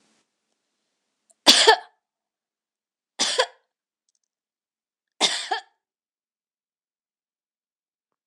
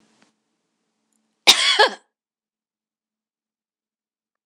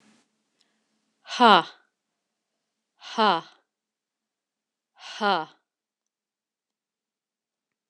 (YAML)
three_cough_length: 8.3 s
three_cough_amplitude: 26028
three_cough_signal_mean_std_ratio: 0.21
cough_length: 4.5 s
cough_amplitude: 26028
cough_signal_mean_std_ratio: 0.21
exhalation_length: 7.9 s
exhalation_amplitude: 25219
exhalation_signal_mean_std_ratio: 0.2
survey_phase: beta (2021-08-13 to 2022-03-07)
age: 45-64
gender: Female
wearing_mask: 'No'
symptom_none: true
smoker_status: Never smoked
respiratory_condition_asthma: false
respiratory_condition_other: false
recruitment_source: REACT
submission_delay: 3 days
covid_test_result: Negative
covid_test_method: RT-qPCR
influenza_a_test_result: Negative
influenza_b_test_result: Negative